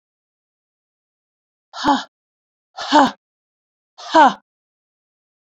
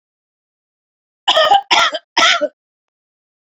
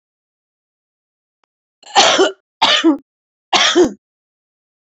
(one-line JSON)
{"exhalation_length": "5.5 s", "exhalation_amplitude": 28193, "exhalation_signal_mean_std_ratio": 0.26, "cough_length": "3.5 s", "cough_amplitude": 31241, "cough_signal_mean_std_ratio": 0.4, "three_cough_length": "4.9 s", "three_cough_amplitude": 30539, "three_cough_signal_mean_std_ratio": 0.39, "survey_phase": "beta (2021-08-13 to 2022-03-07)", "age": "45-64", "gender": "Female", "wearing_mask": "No", "symptom_runny_or_blocked_nose": true, "symptom_shortness_of_breath": true, "symptom_fatigue": true, "symptom_headache": true, "symptom_change_to_sense_of_smell_or_taste": true, "symptom_loss_of_taste": true, "symptom_other": true, "symptom_onset": "5 days", "smoker_status": "Ex-smoker", "respiratory_condition_asthma": false, "respiratory_condition_other": true, "recruitment_source": "Test and Trace", "submission_delay": "1 day", "covid_test_result": "Positive", "covid_test_method": "RT-qPCR", "covid_ct_value": 27.3, "covid_ct_gene": "N gene"}